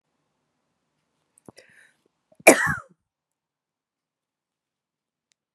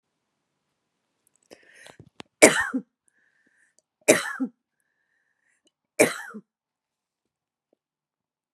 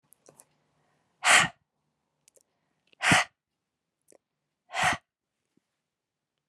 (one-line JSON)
{"cough_length": "5.5 s", "cough_amplitude": 32768, "cough_signal_mean_std_ratio": 0.14, "three_cough_length": "8.5 s", "three_cough_amplitude": 32768, "three_cough_signal_mean_std_ratio": 0.19, "exhalation_length": "6.5 s", "exhalation_amplitude": 16174, "exhalation_signal_mean_std_ratio": 0.24, "survey_phase": "beta (2021-08-13 to 2022-03-07)", "age": "65+", "gender": "Female", "wearing_mask": "No", "symptom_fatigue": true, "smoker_status": "Never smoked", "respiratory_condition_asthma": false, "respiratory_condition_other": false, "recruitment_source": "Test and Trace", "submission_delay": "2 days", "covid_test_result": "Positive", "covid_test_method": "RT-qPCR", "covid_ct_value": 20.7, "covid_ct_gene": "ORF1ab gene", "covid_ct_mean": 21.5, "covid_viral_load": "90000 copies/ml", "covid_viral_load_category": "Low viral load (10K-1M copies/ml)"}